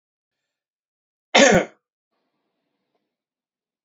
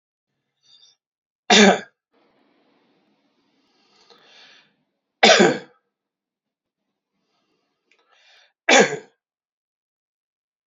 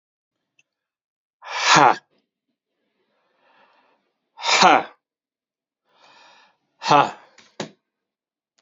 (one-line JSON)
{"cough_length": "3.8 s", "cough_amplitude": 29385, "cough_signal_mean_std_ratio": 0.22, "three_cough_length": "10.7 s", "three_cough_amplitude": 30603, "three_cough_signal_mean_std_ratio": 0.22, "exhalation_length": "8.6 s", "exhalation_amplitude": 31497, "exhalation_signal_mean_std_ratio": 0.26, "survey_phase": "beta (2021-08-13 to 2022-03-07)", "age": "65+", "gender": "Male", "wearing_mask": "No", "symptom_none": true, "symptom_onset": "9 days", "smoker_status": "Never smoked", "respiratory_condition_asthma": false, "respiratory_condition_other": false, "recruitment_source": "REACT", "submission_delay": "1 day", "covid_test_result": "Negative", "covid_test_method": "RT-qPCR"}